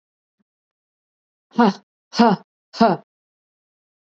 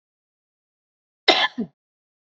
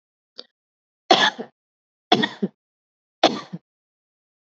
exhalation_length: 4.0 s
exhalation_amplitude: 27604
exhalation_signal_mean_std_ratio: 0.28
cough_length: 2.4 s
cough_amplitude: 28006
cough_signal_mean_std_ratio: 0.23
three_cough_length: 4.4 s
three_cough_amplitude: 30647
three_cough_signal_mean_std_ratio: 0.26
survey_phase: alpha (2021-03-01 to 2021-08-12)
age: 45-64
gender: Female
wearing_mask: 'No'
symptom_none: true
smoker_status: Never smoked
respiratory_condition_asthma: false
respiratory_condition_other: false
recruitment_source: REACT
submission_delay: 3 days
covid_test_result: Negative
covid_test_method: RT-qPCR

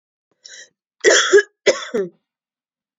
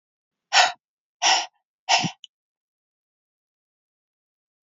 cough_length: 3.0 s
cough_amplitude: 29336
cough_signal_mean_std_ratio: 0.35
exhalation_length: 4.8 s
exhalation_amplitude: 24059
exhalation_signal_mean_std_ratio: 0.27
survey_phase: beta (2021-08-13 to 2022-03-07)
age: 45-64
gender: Female
wearing_mask: 'No'
symptom_cough_any: true
symptom_runny_or_blocked_nose: true
symptom_headache: true
smoker_status: Ex-smoker
respiratory_condition_asthma: false
respiratory_condition_other: false
recruitment_source: Test and Trace
submission_delay: 1 day
covid_test_result: Positive
covid_test_method: RT-qPCR
covid_ct_value: 20.5
covid_ct_gene: N gene
covid_ct_mean: 22.1
covid_viral_load: 58000 copies/ml
covid_viral_load_category: Low viral load (10K-1M copies/ml)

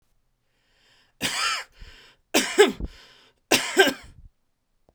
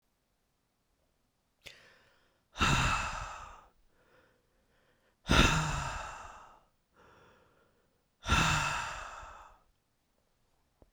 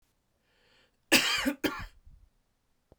three_cough_length: 4.9 s
three_cough_amplitude: 26967
three_cough_signal_mean_std_ratio: 0.34
exhalation_length: 10.9 s
exhalation_amplitude: 12913
exhalation_signal_mean_std_ratio: 0.36
cough_length: 3.0 s
cough_amplitude: 13579
cough_signal_mean_std_ratio: 0.33
survey_phase: beta (2021-08-13 to 2022-03-07)
age: 45-64
gender: Male
wearing_mask: 'No'
symptom_none: true
smoker_status: Never smoked
respiratory_condition_asthma: false
respiratory_condition_other: false
recruitment_source: REACT
submission_delay: 5 days
covid_test_result: Negative
covid_test_method: RT-qPCR
influenza_a_test_result: Unknown/Void
influenza_b_test_result: Unknown/Void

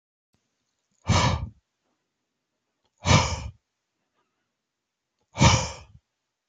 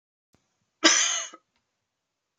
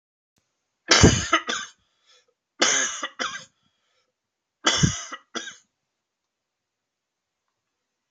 exhalation_length: 6.5 s
exhalation_amplitude: 24764
exhalation_signal_mean_std_ratio: 0.3
cough_length: 2.4 s
cough_amplitude: 23917
cough_signal_mean_std_ratio: 0.3
three_cough_length: 8.1 s
three_cough_amplitude: 26940
three_cough_signal_mean_std_ratio: 0.3
survey_phase: beta (2021-08-13 to 2022-03-07)
age: 45-64
gender: Male
wearing_mask: 'No'
symptom_cough_any: true
smoker_status: Never smoked
respiratory_condition_asthma: false
respiratory_condition_other: false
recruitment_source: REACT
submission_delay: 2 days
covid_test_result: Negative
covid_test_method: RT-qPCR
influenza_a_test_result: Negative
influenza_b_test_result: Negative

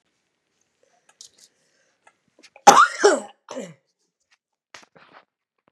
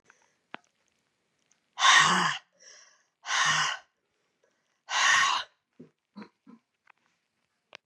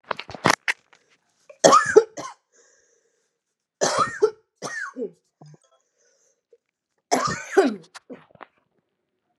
cough_length: 5.7 s
cough_amplitude: 32768
cough_signal_mean_std_ratio: 0.21
exhalation_length: 7.9 s
exhalation_amplitude: 15089
exhalation_signal_mean_std_ratio: 0.36
three_cough_length: 9.4 s
three_cough_amplitude: 32527
three_cough_signal_mean_std_ratio: 0.29
survey_phase: beta (2021-08-13 to 2022-03-07)
age: 45-64
gender: Female
wearing_mask: 'No'
symptom_cough_any: true
symptom_runny_or_blocked_nose: true
symptom_sore_throat: true
symptom_headache: true
symptom_onset: 3 days
smoker_status: Never smoked
respiratory_condition_asthma: false
respiratory_condition_other: false
recruitment_source: Test and Trace
submission_delay: 2 days
covid_test_result: Positive
covid_test_method: RT-qPCR
covid_ct_value: 25.4
covid_ct_gene: ORF1ab gene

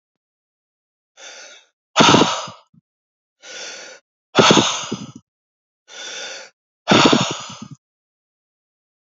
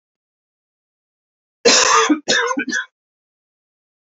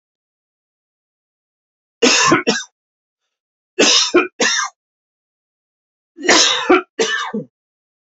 exhalation_length: 9.1 s
exhalation_amplitude: 31159
exhalation_signal_mean_std_ratio: 0.33
cough_length: 4.2 s
cough_amplitude: 28853
cough_signal_mean_std_ratio: 0.39
three_cough_length: 8.2 s
three_cough_amplitude: 32256
three_cough_signal_mean_std_ratio: 0.4
survey_phase: beta (2021-08-13 to 2022-03-07)
age: 45-64
gender: Male
wearing_mask: 'No'
symptom_cough_any: true
symptom_runny_or_blocked_nose: true
symptom_fatigue: true
symptom_headache: true
symptom_other: true
smoker_status: Ex-smoker
respiratory_condition_asthma: false
respiratory_condition_other: false
recruitment_source: Test and Trace
submission_delay: 3 days
covid_test_result: Positive
covid_test_method: ePCR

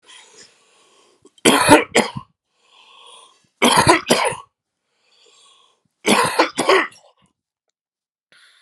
three_cough_length: 8.6 s
three_cough_amplitude: 32768
three_cough_signal_mean_std_ratio: 0.36
survey_phase: beta (2021-08-13 to 2022-03-07)
age: 45-64
gender: Male
wearing_mask: 'No'
symptom_cough_any: true
symptom_runny_or_blocked_nose: true
symptom_shortness_of_breath: true
symptom_fatigue: true
symptom_headache: true
symptom_change_to_sense_of_smell_or_taste: true
symptom_onset: 4 days
smoker_status: Ex-smoker
respiratory_condition_asthma: true
respiratory_condition_other: false
recruitment_source: Test and Trace
submission_delay: 1 day
covid_test_result: Positive
covid_test_method: RT-qPCR
covid_ct_value: 17.5
covid_ct_gene: ORF1ab gene
covid_ct_mean: 17.7
covid_viral_load: 1600000 copies/ml
covid_viral_load_category: High viral load (>1M copies/ml)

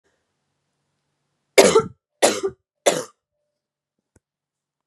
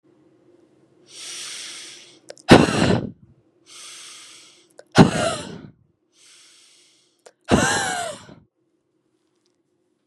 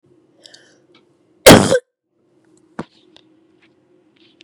three_cough_length: 4.9 s
three_cough_amplitude: 32768
three_cough_signal_mean_std_ratio: 0.25
exhalation_length: 10.1 s
exhalation_amplitude: 32768
exhalation_signal_mean_std_ratio: 0.29
cough_length: 4.4 s
cough_amplitude: 32768
cough_signal_mean_std_ratio: 0.21
survey_phase: beta (2021-08-13 to 2022-03-07)
age: 18-44
gender: Female
wearing_mask: 'No'
symptom_cough_any: true
symptom_runny_or_blocked_nose: true
symptom_onset: 4 days
smoker_status: Never smoked
respiratory_condition_asthma: false
respiratory_condition_other: false
recruitment_source: Test and Trace
submission_delay: 2 days
covid_test_result: Positive
covid_test_method: RT-qPCR
covid_ct_value: 22.1
covid_ct_gene: N gene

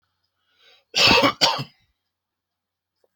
cough_length: 3.2 s
cough_amplitude: 26734
cough_signal_mean_std_ratio: 0.33
survey_phase: alpha (2021-03-01 to 2021-08-12)
age: 45-64
gender: Male
wearing_mask: 'No'
symptom_none: true
smoker_status: Never smoked
respiratory_condition_asthma: false
respiratory_condition_other: false
recruitment_source: REACT
submission_delay: 1 day
covid_test_result: Negative
covid_test_method: RT-qPCR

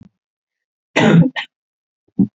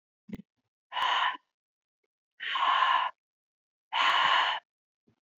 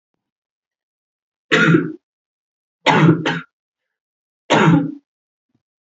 cough_length: 2.4 s
cough_amplitude: 30121
cough_signal_mean_std_ratio: 0.36
exhalation_length: 5.4 s
exhalation_amplitude: 9278
exhalation_signal_mean_std_ratio: 0.49
three_cough_length: 5.8 s
three_cough_amplitude: 31005
three_cough_signal_mean_std_ratio: 0.38
survey_phase: beta (2021-08-13 to 2022-03-07)
age: 18-44
gender: Female
wearing_mask: 'No'
symptom_cough_any: true
symptom_runny_or_blocked_nose: true
symptom_shortness_of_breath: true
symptom_sore_throat: true
symptom_fatigue: true
symptom_fever_high_temperature: true
symptom_headache: true
symptom_change_to_sense_of_smell_or_taste: true
symptom_onset: 4 days
smoker_status: Never smoked
respiratory_condition_asthma: false
respiratory_condition_other: false
recruitment_source: Test and Trace
submission_delay: 2 days
covid_test_result: Positive
covid_test_method: RT-qPCR
covid_ct_value: 16.3
covid_ct_gene: ORF1ab gene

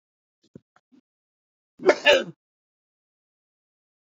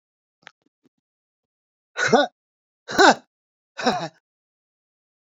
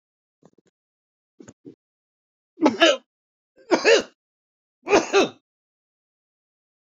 cough_length: 4.0 s
cough_amplitude: 26385
cough_signal_mean_std_ratio: 0.2
exhalation_length: 5.3 s
exhalation_amplitude: 28244
exhalation_signal_mean_std_ratio: 0.25
three_cough_length: 6.9 s
three_cough_amplitude: 26760
three_cough_signal_mean_std_ratio: 0.28
survey_phase: beta (2021-08-13 to 2022-03-07)
age: 65+
gender: Male
wearing_mask: 'No'
symptom_none: true
smoker_status: Never smoked
respiratory_condition_asthma: false
respiratory_condition_other: true
recruitment_source: REACT
submission_delay: 2 days
covid_test_result: Negative
covid_test_method: RT-qPCR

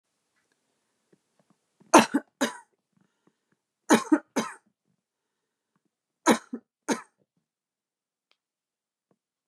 three_cough_length: 9.5 s
three_cough_amplitude: 29487
three_cough_signal_mean_std_ratio: 0.19
survey_phase: beta (2021-08-13 to 2022-03-07)
age: 45-64
gender: Female
wearing_mask: 'No'
symptom_fatigue: true
symptom_onset: 12 days
smoker_status: Never smoked
respiratory_condition_asthma: false
respiratory_condition_other: false
recruitment_source: REACT
submission_delay: 1 day
covid_test_result: Negative
covid_test_method: RT-qPCR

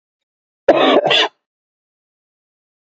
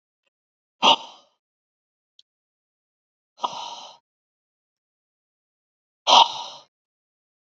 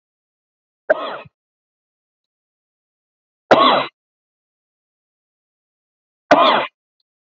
cough_length: 2.9 s
cough_amplitude: 30121
cough_signal_mean_std_ratio: 0.36
exhalation_length: 7.4 s
exhalation_amplitude: 27411
exhalation_signal_mean_std_ratio: 0.2
three_cough_length: 7.3 s
three_cough_amplitude: 28513
three_cough_signal_mean_std_ratio: 0.26
survey_phase: beta (2021-08-13 to 2022-03-07)
age: 18-44
gender: Male
wearing_mask: 'No'
symptom_cough_any: true
symptom_runny_or_blocked_nose: true
symptom_sore_throat: true
symptom_onset: 3 days
smoker_status: Never smoked
respiratory_condition_asthma: false
respiratory_condition_other: false
recruitment_source: Test and Trace
submission_delay: 2 days
covid_test_result: Positive
covid_test_method: ePCR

